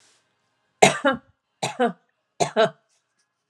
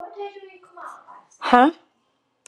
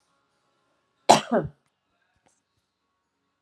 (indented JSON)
{
  "three_cough_length": "3.5 s",
  "three_cough_amplitude": 32689,
  "three_cough_signal_mean_std_ratio": 0.31,
  "exhalation_length": "2.5 s",
  "exhalation_amplitude": 32767,
  "exhalation_signal_mean_std_ratio": 0.29,
  "cough_length": "3.4 s",
  "cough_amplitude": 32767,
  "cough_signal_mean_std_ratio": 0.19,
  "survey_phase": "alpha (2021-03-01 to 2021-08-12)",
  "age": "45-64",
  "gender": "Female",
  "wearing_mask": "No",
  "symptom_none": true,
  "smoker_status": "Ex-smoker",
  "respiratory_condition_asthma": false,
  "respiratory_condition_other": false,
  "recruitment_source": "Test and Trace",
  "submission_delay": "2 days",
  "covid_test_result": "Negative",
  "covid_test_method": "RT-qPCR"
}